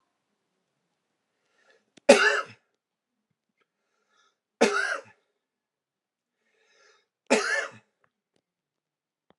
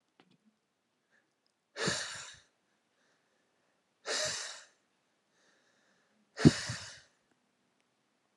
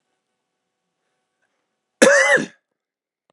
{
  "three_cough_length": "9.4 s",
  "three_cough_amplitude": 31768,
  "three_cough_signal_mean_std_ratio": 0.22,
  "exhalation_length": "8.4 s",
  "exhalation_amplitude": 15972,
  "exhalation_signal_mean_std_ratio": 0.21,
  "cough_length": "3.3 s",
  "cough_amplitude": 32768,
  "cough_signal_mean_std_ratio": 0.28,
  "survey_phase": "beta (2021-08-13 to 2022-03-07)",
  "age": "18-44",
  "gender": "Male",
  "wearing_mask": "No",
  "symptom_cough_any": true,
  "symptom_runny_or_blocked_nose": true,
  "symptom_fatigue": true,
  "symptom_fever_high_temperature": true,
  "smoker_status": "Never smoked",
  "respiratory_condition_asthma": false,
  "respiratory_condition_other": false,
  "recruitment_source": "Test and Trace",
  "submission_delay": "2 days",
  "covid_test_result": "Positive",
  "covid_test_method": "RT-qPCR",
  "covid_ct_value": 17.0,
  "covid_ct_gene": "ORF1ab gene",
  "covid_ct_mean": 17.3,
  "covid_viral_load": "2200000 copies/ml",
  "covid_viral_load_category": "High viral load (>1M copies/ml)"
}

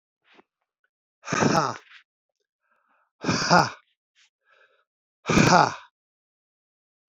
{
  "exhalation_length": "7.1 s",
  "exhalation_amplitude": 24711,
  "exhalation_signal_mean_std_ratio": 0.31,
  "survey_phase": "beta (2021-08-13 to 2022-03-07)",
  "age": "65+",
  "gender": "Male",
  "wearing_mask": "No",
  "symptom_cough_any": true,
  "symptom_runny_or_blocked_nose": true,
  "symptom_sore_throat": true,
  "symptom_fatigue": true,
  "symptom_fever_high_temperature": true,
  "symptom_onset": "2 days",
  "smoker_status": "Ex-smoker",
  "respiratory_condition_asthma": false,
  "respiratory_condition_other": false,
  "recruitment_source": "Test and Trace",
  "submission_delay": "1 day",
  "covid_test_result": "Positive",
  "covid_test_method": "RT-qPCR",
  "covid_ct_value": 16.5,
  "covid_ct_gene": "ORF1ab gene",
  "covid_ct_mean": 17.5,
  "covid_viral_load": "1800000 copies/ml",
  "covid_viral_load_category": "High viral load (>1M copies/ml)"
}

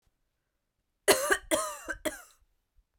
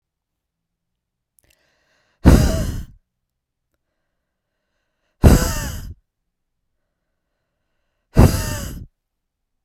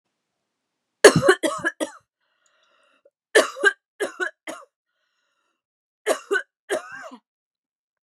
{
  "cough_length": "3.0 s",
  "cough_amplitude": 14578,
  "cough_signal_mean_std_ratio": 0.34,
  "exhalation_length": "9.6 s",
  "exhalation_amplitude": 32768,
  "exhalation_signal_mean_std_ratio": 0.26,
  "three_cough_length": "8.0 s",
  "three_cough_amplitude": 32768,
  "three_cough_signal_mean_std_ratio": 0.26,
  "survey_phase": "beta (2021-08-13 to 2022-03-07)",
  "age": "18-44",
  "gender": "Female",
  "wearing_mask": "No",
  "symptom_prefer_not_to_say": true,
  "symptom_onset": "7 days",
  "smoker_status": "Never smoked",
  "respiratory_condition_asthma": false,
  "respiratory_condition_other": false,
  "recruitment_source": "REACT",
  "submission_delay": "1 day",
  "covid_test_result": "Negative",
  "covid_test_method": "RT-qPCR"
}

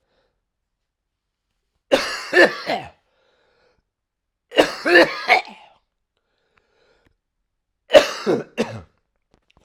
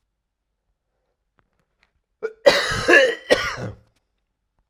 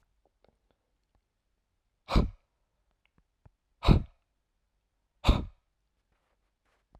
{
  "three_cough_length": "9.6 s",
  "three_cough_amplitude": 32768,
  "three_cough_signal_mean_std_ratio": 0.29,
  "cough_length": "4.7 s",
  "cough_amplitude": 32768,
  "cough_signal_mean_std_ratio": 0.33,
  "exhalation_length": "7.0 s",
  "exhalation_amplitude": 13757,
  "exhalation_signal_mean_std_ratio": 0.19,
  "survey_phase": "alpha (2021-03-01 to 2021-08-12)",
  "age": "45-64",
  "gender": "Male",
  "wearing_mask": "No",
  "symptom_none": true,
  "smoker_status": "Current smoker (1 to 10 cigarettes per day)",
  "respiratory_condition_asthma": false,
  "respiratory_condition_other": false,
  "recruitment_source": "REACT",
  "submission_delay": "1 day",
  "covid_test_result": "Negative",
  "covid_test_method": "RT-qPCR"
}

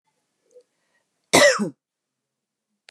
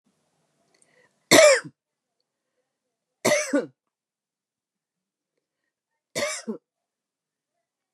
{
  "cough_length": "2.9 s",
  "cough_amplitude": 32637,
  "cough_signal_mean_std_ratio": 0.25,
  "three_cough_length": "7.9 s",
  "three_cough_amplitude": 28279,
  "three_cough_signal_mean_std_ratio": 0.23,
  "survey_phase": "beta (2021-08-13 to 2022-03-07)",
  "age": "45-64",
  "gender": "Female",
  "wearing_mask": "No",
  "symptom_fatigue": true,
  "symptom_change_to_sense_of_smell_or_taste": true,
  "symptom_onset": "8 days",
  "smoker_status": "Ex-smoker",
  "respiratory_condition_asthma": false,
  "respiratory_condition_other": false,
  "recruitment_source": "Test and Trace",
  "submission_delay": "3 days",
  "covid_test_result": "Negative",
  "covid_test_method": "ePCR"
}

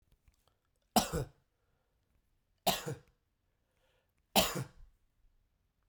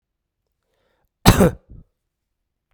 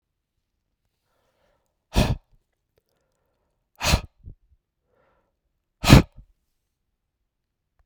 {
  "three_cough_length": "5.9 s",
  "three_cough_amplitude": 7682,
  "three_cough_signal_mean_std_ratio": 0.25,
  "cough_length": "2.7 s",
  "cough_amplitude": 32768,
  "cough_signal_mean_std_ratio": 0.23,
  "exhalation_length": "7.9 s",
  "exhalation_amplitude": 32768,
  "exhalation_signal_mean_std_ratio": 0.18,
  "survey_phase": "beta (2021-08-13 to 2022-03-07)",
  "age": "45-64",
  "gender": "Male",
  "wearing_mask": "No",
  "symptom_none": true,
  "smoker_status": "Ex-smoker",
  "respiratory_condition_asthma": false,
  "respiratory_condition_other": false,
  "recruitment_source": "REACT",
  "submission_delay": "1 day",
  "covid_test_result": "Negative",
  "covid_test_method": "RT-qPCR"
}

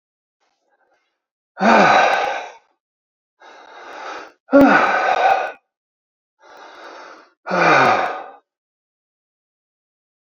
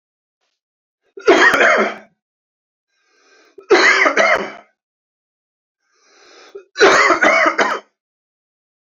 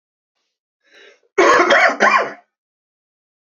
{
  "exhalation_length": "10.2 s",
  "exhalation_amplitude": 29635,
  "exhalation_signal_mean_std_ratio": 0.41,
  "three_cough_length": "9.0 s",
  "three_cough_amplitude": 31295,
  "three_cough_signal_mean_std_ratio": 0.42,
  "cough_length": "3.5 s",
  "cough_amplitude": 29277,
  "cough_signal_mean_std_ratio": 0.41,
  "survey_phase": "beta (2021-08-13 to 2022-03-07)",
  "age": "45-64",
  "gender": "Male",
  "wearing_mask": "No",
  "symptom_cough_any": true,
  "symptom_abdominal_pain": true,
  "symptom_headache": true,
  "smoker_status": "Ex-smoker",
  "respiratory_condition_asthma": false,
  "respiratory_condition_other": false,
  "recruitment_source": "Test and Trace",
  "submission_delay": "2 days",
  "covid_test_result": "Positive",
  "covid_test_method": "RT-qPCR",
  "covid_ct_value": 13.7,
  "covid_ct_gene": "ORF1ab gene",
  "covid_ct_mean": 13.9,
  "covid_viral_load": "28000000 copies/ml",
  "covid_viral_load_category": "High viral load (>1M copies/ml)"
}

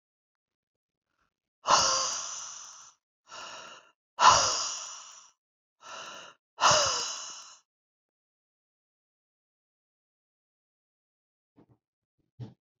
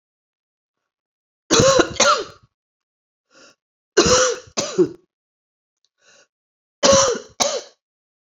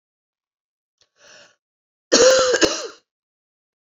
{
  "exhalation_length": "12.8 s",
  "exhalation_amplitude": 17500,
  "exhalation_signal_mean_std_ratio": 0.3,
  "three_cough_length": "8.4 s",
  "three_cough_amplitude": 28702,
  "three_cough_signal_mean_std_ratio": 0.37,
  "cough_length": "3.8 s",
  "cough_amplitude": 29995,
  "cough_signal_mean_std_ratio": 0.33,
  "survey_phase": "beta (2021-08-13 to 2022-03-07)",
  "age": "45-64",
  "gender": "Female",
  "wearing_mask": "No",
  "symptom_cough_any": true,
  "symptom_runny_or_blocked_nose": true,
  "symptom_fatigue": true,
  "symptom_headache": true,
  "symptom_change_to_sense_of_smell_or_taste": true,
  "symptom_onset": "4 days",
  "smoker_status": "Ex-smoker",
  "respiratory_condition_asthma": false,
  "respiratory_condition_other": false,
  "recruitment_source": "Test and Trace",
  "submission_delay": "2 days",
  "covid_test_result": "Positive",
  "covid_test_method": "RT-qPCR",
  "covid_ct_value": 19.9,
  "covid_ct_gene": "ORF1ab gene"
}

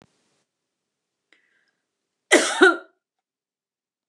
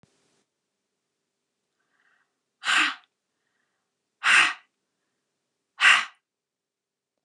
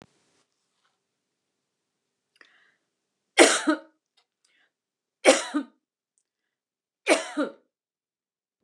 {
  "cough_length": "4.1 s",
  "cough_amplitude": 28160,
  "cough_signal_mean_std_ratio": 0.22,
  "exhalation_length": "7.2 s",
  "exhalation_amplitude": 20887,
  "exhalation_signal_mean_std_ratio": 0.25,
  "three_cough_length": "8.6 s",
  "three_cough_amplitude": 28931,
  "three_cough_signal_mean_std_ratio": 0.22,
  "survey_phase": "beta (2021-08-13 to 2022-03-07)",
  "age": "65+",
  "gender": "Female",
  "wearing_mask": "No",
  "symptom_none": true,
  "smoker_status": "Never smoked",
  "respiratory_condition_asthma": false,
  "respiratory_condition_other": false,
  "recruitment_source": "REACT",
  "submission_delay": "1 day",
  "covid_test_result": "Negative",
  "covid_test_method": "RT-qPCR",
  "influenza_a_test_result": "Negative",
  "influenza_b_test_result": "Negative"
}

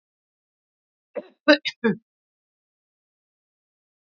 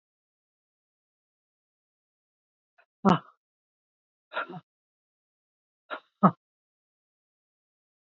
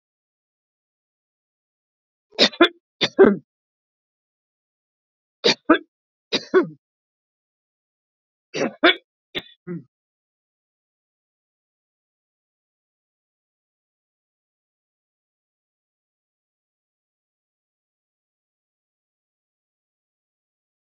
{
  "cough_length": "4.2 s",
  "cough_amplitude": 26530,
  "cough_signal_mean_std_ratio": 0.17,
  "exhalation_length": "8.0 s",
  "exhalation_amplitude": 19022,
  "exhalation_signal_mean_std_ratio": 0.14,
  "three_cough_length": "20.8 s",
  "three_cough_amplitude": 30039,
  "three_cough_signal_mean_std_ratio": 0.16,
  "survey_phase": "beta (2021-08-13 to 2022-03-07)",
  "age": "65+",
  "gender": "Female",
  "wearing_mask": "No",
  "symptom_shortness_of_breath": true,
  "symptom_fatigue": true,
  "symptom_onset": "12 days",
  "smoker_status": "Never smoked",
  "respiratory_condition_asthma": false,
  "respiratory_condition_other": false,
  "recruitment_source": "REACT",
  "submission_delay": "2 days",
  "covid_test_result": "Negative",
  "covid_test_method": "RT-qPCR",
  "influenza_a_test_result": "Negative",
  "influenza_b_test_result": "Negative"
}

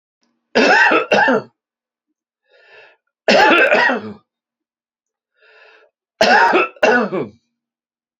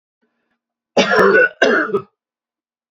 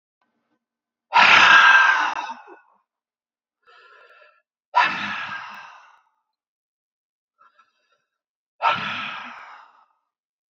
{
  "three_cough_length": "8.2 s",
  "three_cough_amplitude": 32768,
  "three_cough_signal_mean_std_ratio": 0.46,
  "cough_length": "2.9 s",
  "cough_amplitude": 29002,
  "cough_signal_mean_std_ratio": 0.46,
  "exhalation_length": "10.5 s",
  "exhalation_amplitude": 32768,
  "exhalation_signal_mean_std_ratio": 0.33,
  "survey_phase": "beta (2021-08-13 to 2022-03-07)",
  "age": "65+",
  "gender": "Male",
  "wearing_mask": "No",
  "symptom_none": true,
  "symptom_onset": "6 days",
  "smoker_status": "Ex-smoker",
  "respiratory_condition_asthma": false,
  "respiratory_condition_other": false,
  "recruitment_source": "REACT",
  "submission_delay": "1 day",
  "covid_test_result": "Negative",
  "covid_test_method": "RT-qPCR",
  "influenza_a_test_result": "Unknown/Void",
  "influenza_b_test_result": "Unknown/Void"
}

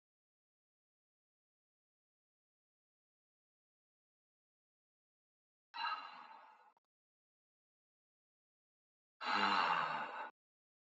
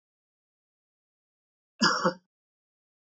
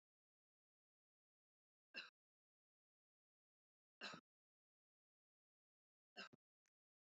{
  "exhalation_length": "10.9 s",
  "exhalation_amplitude": 2574,
  "exhalation_signal_mean_std_ratio": 0.27,
  "cough_length": "3.2 s",
  "cough_amplitude": 11158,
  "cough_signal_mean_std_ratio": 0.23,
  "three_cough_length": "7.2 s",
  "three_cough_amplitude": 355,
  "three_cough_signal_mean_std_ratio": 0.18,
  "survey_phase": "beta (2021-08-13 to 2022-03-07)",
  "age": "65+",
  "gender": "Male",
  "wearing_mask": "No",
  "symptom_none": true,
  "symptom_onset": "12 days",
  "smoker_status": "Never smoked",
  "respiratory_condition_asthma": false,
  "respiratory_condition_other": false,
  "recruitment_source": "REACT",
  "submission_delay": "1 day",
  "covid_test_result": "Negative",
  "covid_test_method": "RT-qPCR"
}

